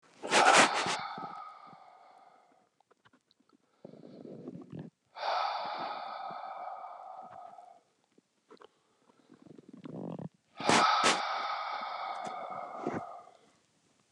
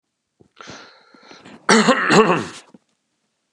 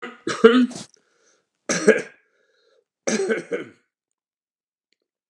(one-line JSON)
{"exhalation_length": "14.1 s", "exhalation_amplitude": 12119, "exhalation_signal_mean_std_ratio": 0.43, "cough_length": "3.5 s", "cough_amplitude": 32767, "cough_signal_mean_std_ratio": 0.37, "three_cough_length": "5.3 s", "three_cough_amplitude": 32768, "three_cough_signal_mean_std_ratio": 0.32, "survey_phase": "beta (2021-08-13 to 2022-03-07)", "age": "45-64", "gender": "Male", "wearing_mask": "No", "symptom_fatigue": true, "symptom_fever_high_temperature": true, "symptom_headache": true, "symptom_onset": "3 days", "smoker_status": "Never smoked", "respiratory_condition_asthma": false, "respiratory_condition_other": false, "recruitment_source": "Test and Trace", "submission_delay": "1 day", "covid_test_result": "Positive", "covid_test_method": "RT-qPCR", "covid_ct_value": 13.1, "covid_ct_gene": "ORF1ab gene"}